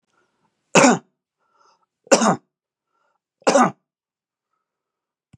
{"three_cough_length": "5.4 s", "three_cough_amplitude": 32734, "three_cough_signal_mean_std_ratio": 0.27, "survey_phase": "beta (2021-08-13 to 2022-03-07)", "age": "65+", "gender": "Male", "wearing_mask": "No", "symptom_none": true, "smoker_status": "Ex-smoker", "respiratory_condition_asthma": false, "respiratory_condition_other": false, "recruitment_source": "REACT", "submission_delay": "2 days", "covid_test_result": "Negative", "covid_test_method": "RT-qPCR", "influenza_a_test_result": "Negative", "influenza_b_test_result": "Negative"}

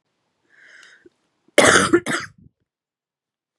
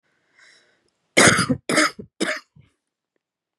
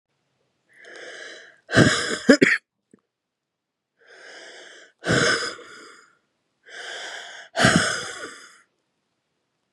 {"cough_length": "3.6 s", "cough_amplitude": 32768, "cough_signal_mean_std_ratio": 0.29, "three_cough_length": "3.6 s", "three_cough_amplitude": 31204, "three_cough_signal_mean_std_ratio": 0.34, "exhalation_length": "9.7 s", "exhalation_amplitude": 32758, "exhalation_signal_mean_std_ratio": 0.34, "survey_phase": "beta (2021-08-13 to 2022-03-07)", "age": "18-44", "gender": "Female", "wearing_mask": "No", "symptom_cough_any": true, "symptom_runny_or_blocked_nose": true, "symptom_sore_throat": true, "symptom_abdominal_pain": true, "symptom_fatigue": true, "symptom_headache": true, "symptom_change_to_sense_of_smell_or_taste": true, "symptom_onset": "4 days", "smoker_status": "Current smoker (e-cigarettes or vapes only)", "respiratory_condition_asthma": true, "respiratory_condition_other": false, "recruitment_source": "Test and Trace", "submission_delay": "1 day", "covid_test_result": "Positive", "covid_test_method": "RT-qPCR", "covid_ct_value": 19.1, "covid_ct_gene": "ORF1ab gene"}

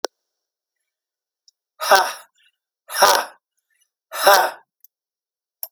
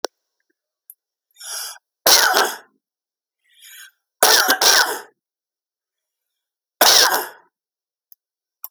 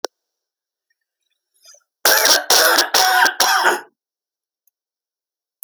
{"exhalation_length": "5.7 s", "exhalation_amplitude": 32768, "exhalation_signal_mean_std_ratio": 0.3, "three_cough_length": "8.7 s", "three_cough_amplitude": 32768, "three_cough_signal_mean_std_ratio": 0.34, "cough_length": "5.6 s", "cough_amplitude": 32768, "cough_signal_mean_std_ratio": 0.43, "survey_phase": "alpha (2021-03-01 to 2021-08-12)", "age": "45-64", "gender": "Male", "wearing_mask": "No", "symptom_change_to_sense_of_smell_or_taste": true, "smoker_status": "Ex-smoker", "respiratory_condition_asthma": false, "respiratory_condition_other": false, "recruitment_source": "REACT", "submission_delay": "1 day", "covid_test_result": "Negative", "covid_test_method": "RT-qPCR"}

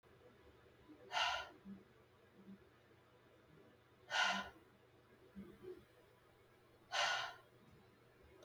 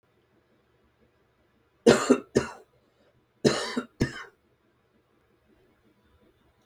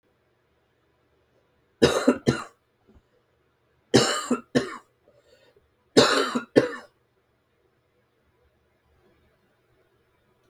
{"exhalation_length": "8.4 s", "exhalation_amplitude": 2082, "exhalation_signal_mean_std_ratio": 0.39, "cough_length": "6.7 s", "cough_amplitude": 22496, "cough_signal_mean_std_ratio": 0.24, "three_cough_length": "10.5 s", "three_cough_amplitude": 26838, "three_cough_signal_mean_std_ratio": 0.27, "survey_phase": "beta (2021-08-13 to 2022-03-07)", "age": "18-44", "gender": "Male", "wearing_mask": "No", "symptom_cough_any": true, "symptom_shortness_of_breath": true, "symptom_sore_throat": true, "symptom_abdominal_pain": true, "symptom_onset": "5 days", "smoker_status": "Ex-smoker", "respiratory_condition_asthma": false, "respiratory_condition_other": true, "recruitment_source": "Test and Trace", "submission_delay": "1 day", "covid_test_result": "Negative", "covid_test_method": "RT-qPCR"}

